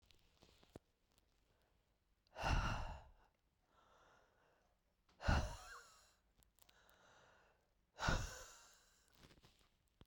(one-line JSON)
{"exhalation_length": "10.1 s", "exhalation_amplitude": 2456, "exhalation_signal_mean_std_ratio": 0.3, "survey_phase": "beta (2021-08-13 to 2022-03-07)", "age": "45-64", "gender": "Female", "wearing_mask": "No", "symptom_cough_any": true, "symptom_runny_or_blocked_nose": true, "symptom_shortness_of_breath": true, "symptom_sore_throat": true, "symptom_diarrhoea": true, "symptom_fatigue": true, "symptom_headache": true, "smoker_status": "Ex-smoker", "respiratory_condition_asthma": false, "respiratory_condition_other": false, "recruitment_source": "Test and Trace", "submission_delay": "0 days", "covid_test_result": "Positive", "covid_test_method": "LFT"}